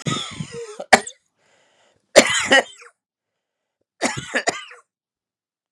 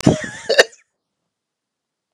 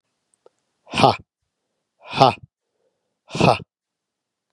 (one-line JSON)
{"three_cough_length": "5.7 s", "three_cough_amplitude": 32768, "three_cough_signal_mean_std_ratio": 0.3, "cough_length": "2.1 s", "cough_amplitude": 32768, "cough_signal_mean_std_ratio": 0.28, "exhalation_length": "4.5 s", "exhalation_amplitude": 32768, "exhalation_signal_mean_std_ratio": 0.25, "survey_phase": "beta (2021-08-13 to 2022-03-07)", "age": "45-64", "gender": "Male", "wearing_mask": "No", "symptom_cough_any": true, "symptom_new_continuous_cough": true, "symptom_runny_or_blocked_nose": true, "symptom_shortness_of_breath": true, "symptom_sore_throat": true, "symptom_headache": true, "smoker_status": "Never smoked", "respiratory_condition_asthma": false, "respiratory_condition_other": false, "recruitment_source": "Test and Trace", "submission_delay": "2 days", "covid_test_result": "Positive", "covid_test_method": "RT-qPCR", "covid_ct_value": 12.1, "covid_ct_gene": "ORF1ab gene"}